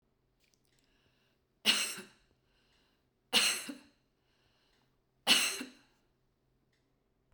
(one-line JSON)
{"three_cough_length": "7.3 s", "three_cough_amplitude": 9446, "three_cough_signal_mean_std_ratio": 0.27, "survey_phase": "beta (2021-08-13 to 2022-03-07)", "age": "65+", "gender": "Female", "wearing_mask": "No", "symptom_none": true, "smoker_status": "Ex-smoker", "respiratory_condition_asthma": false, "respiratory_condition_other": false, "recruitment_source": "REACT", "submission_delay": "2 days", "covid_test_result": "Negative", "covid_test_method": "RT-qPCR"}